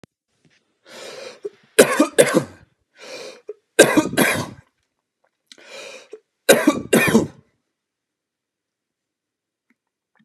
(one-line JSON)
{"three_cough_length": "10.2 s", "three_cough_amplitude": 32768, "three_cough_signal_mean_std_ratio": 0.31, "survey_phase": "beta (2021-08-13 to 2022-03-07)", "age": "65+", "gender": "Male", "wearing_mask": "No", "symptom_none": true, "smoker_status": "Never smoked", "respiratory_condition_asthma": false, "respiratory_condition_other": false, "recruitment_source": "REACT", "submission_delay": "3 days", "covid_test_result": "Negative", "covid_test_method": "RT-qPCR", "influenza_a_test_result": "Negative", "influenza_b_test_result": "Negative"}